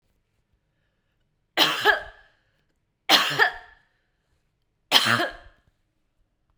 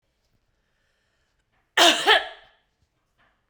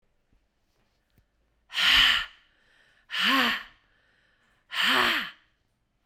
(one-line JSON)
{"three_cough_length": "6.6 s", "three_cough_amplitude": 26844, "three_cough_signal_mean_std_ratio": 0.32, "cough_length": "3.5 s", "cough_amplitude": 24655, "cough_signal_mean_std_ratio": 0.27, "exhalation_length": "6.1 s", "exhalation_amplitude": 13465, "exhalation_signal_mean_std_ratio": 0.41, "survey_phase": "beta (2021-08-13 to 2022-03-07)", "age": "45-64", "gender": "Female", "wearing_mask": "No", "symptom_none": true, "symptom_onset": "8 days", "smoker_status": "Ex-smoker", "respiratory_condition_asthma": false, "respiratory_condition_other": false, "recruitment_source": "REACT", "submission_delay": "2 days", "covid_test_result": "Negative", "covid_test_method": "RT-qPCR"}